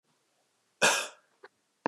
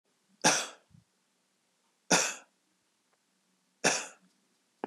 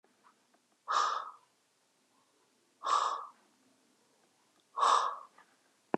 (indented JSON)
{
  "cough_length": "1.9 s",
  "cough_amplitude": 10824,
  "cough_signal_mean_std_ratio": 0.28,
  "three_cough_length": "4.9 s",
  "three_cough_amplitude": 11718,
  "three_cough_signal_mean_std_ratio": 0.28,
  "exhalation_length": "6.0 s",
  "exhalation_amplitude": 6957,
  "exhalation_signal_mean_std_ratio": 0.35,
  "survey_phase": "beta (2021-08-13 to 2022-03-07)",
  "age": "18-44",
  "gender": "Male",
  "wearing_mask": "No",
  "symptom_none": true,
  "smoker_status": "Ex-smoker",
  "respiratory_condition_asthma": false,
  "respiratory_condition_other": false,
  "recruitment_source": "REACT",
  "submission_delay": "1 day",
  "covid_test_result": "Negative",
  "covid_test_method": "RT-qPCR",
  "influenza_a_test_result": "Unknown/Void",
  "influenza_b_test_result": "Unknown/Void"
}